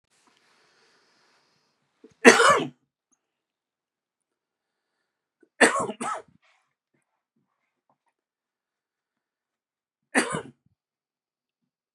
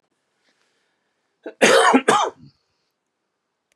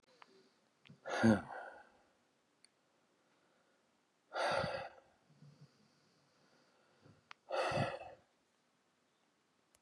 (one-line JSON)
{"three_cough_length": "11.9 s", "three_cough_amplitude": 32325, "three_cough_signal_mean_std_ratio": 0.19, "cough_length": "3.8 s", "cough_amplitude": 29289, "cough_signal_mean_std_ratio": 0.33, "exhalation_length": "9.8 s", "exhalation_amplitude": 4188, "exhalation_signal_mean_std_ratio": 0.3, "survey_phase": "beta (2021-08-13 to 2022-03-07)", "age": "45-64", "gender": "Male", "wearing_mask": "No", "symptom_cough_any": true, "symptom_fatigue": true, "symptom_headache": true, "symptom_change_to_sense_of_smell_or_taste": true, "symptom_loss_of_taste": true, "symptom_other": true, "symptom_onset": "6 days", "smoker_status": "Never smoked", "respiratory_condition_asthma": false, "respiratory_condition_other": false, "recruitment_source": "Test and Trace", "submission_delay": "1 day", "covid_test_result": "Positive", "covid_test_method": "ePCR"}